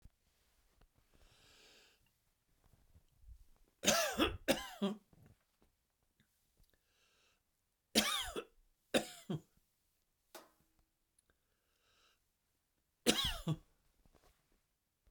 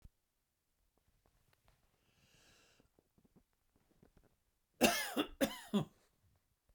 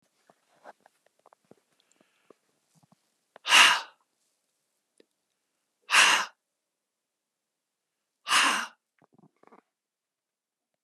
{
  "three_cough_length": "15.1 s",
  "three_cough_amplitude": 5811,
  "three_cough_signal_mean_std_ratio": 0.27,
  "cough_length": "6.7 s",
  "cough_amplitude": 5600,
  "cough_signal_mean_std_ratio": 0.24,
  "exhalation_length": "10.8 s",
  "exhalation_amplitude": 20358,
  "exhalation_signal_mean_std_ratio": 0.23,
  "survey_phase": "beta (2021-08-13 to 2022-03-07)",
  "age": "65+",
  "gender": "Male",
  "wearing_mask": "No",
  "symptom_cough_any": true,
  "symptom_shortness_of_breath": true,
  "symptom_other": true,
  "symptom_onset": "12 days",
  "smoker_status": "Ex-smoker",
  "respiratory_condition_asthma": false,
  "respiratory_condition_other": false,
  "recruitment_source": "REACT",
  "submission_delay": "1 day",
  "covid_test_result": "Negative",
  "covid_test_method": "RT-qPCR"
}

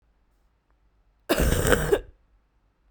{
  "cough_length": "2.9 s",
  "cough_amplitude": 28915,
  "cough_signal_mean_std_ratio": 0.39,
  "survey_phase": "beta (2021-08-13 to 2022-03-07)",
  "age": "18-44",
  "gender": "Female",
  "wearing_mask": "No",
  "symptom_new_continuous_cough": true,
  "symptom_fatigue": true,
  "symptom_headache": true,
  "symptom_change_to_sense_of_smell_or_taste": true,
  "symptom_loss_of_taste": true,
  "symptom_other": true,
  "symptom_onset": "4 days",
  "smoker_status": "Current smoker (e-cigarettes or vapes only)",
  "respiratory_condition_asthma": false,
  "respiratory_condition_other": false,
  "recruitment_source": "Test and Trace",
  "submission_delay": "2 days",
  "covid_test_result": "Positive",
  "covid_test_method": "RT-qPCR",
  "covid_ct_value": 15.9,
  "covid_ct_gene": "N gene",
  "covid_ct_mean": 16.3,
  "covid_viral_load": "4500000 copies/ml",
  "covid_viral_load_category": "High viral load (>1M copies/ml)"
}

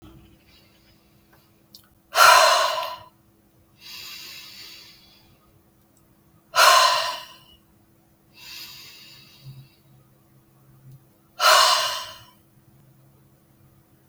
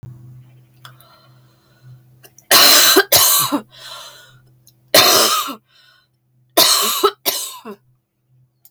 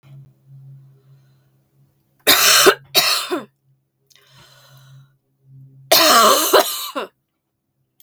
{
  "exhalation_length": "14.1 s",
  "exhalation_amplitude": 29656,
  "exhalation_signal_mean_std_ratio": 0.31,
  "cough_length": "8.7 s",
  "cough_amplitude": 32768,
  "cough_signal_mean_std_ratio": 0.42,
  "three_cough_length": "8.0 s",
  "three_cough_amplitude": 32768,
  "three_cough_signal_mean_std_ratio": 0.39,
  "survey_phase": "beta (2021-08-13 to 2022-03-07)",
  "age": "45-64",
  "gender": "Female",
  "wearing_mask": "No",
  "symptom_cough_any": true,
  "smoker_status": "Never smoked",
  "respiratory_condition_asthma": true,
  "respiratory_condition_other": false,
  "recruitment_source": "REACT",
  "submission_delay": "3 days",
  "covid_test_result": "Negative",
  "covid_test_method": "RT-qPCR",
  "influenza_a_test_result": "Negative",
  "influenza_b_test_result": "Negative"
}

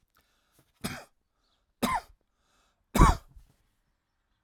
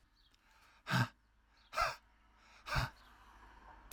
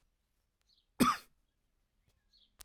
{
  "three_cough_length": "4.4 s",
  "three_cough_amplitude": 17879,
  "three_cough_signal_mean_std_ratio": 0.22,
  "exhalation_length": "3.9 s",
  "exhalation_amplitude": 3326,
  "exhalation_signal_mean_std_ratio": 0.36,
  "cough_length": "2.6 s",
  "cough_amplitude": 6245,
  "cough_signal_mean_std_ratio": 0.2,
  "survey_phase": "alpha (2021-03-01 to 2021-08-12)",
  "age": "45-64",
  "gender": "Male",
  "wearing_mask": "No",
  "symptom_none": true,
  "smoker_status": "Never smoked",
  "respiratory_condition_asthma": false,
  "respiratory_condition_other": false,
  "recruitment_source": "REACT",
  "submission_delay": "1 day",
  "covid_test_result": "Negative",
  "covid_test_method": "RT-qPCR"
}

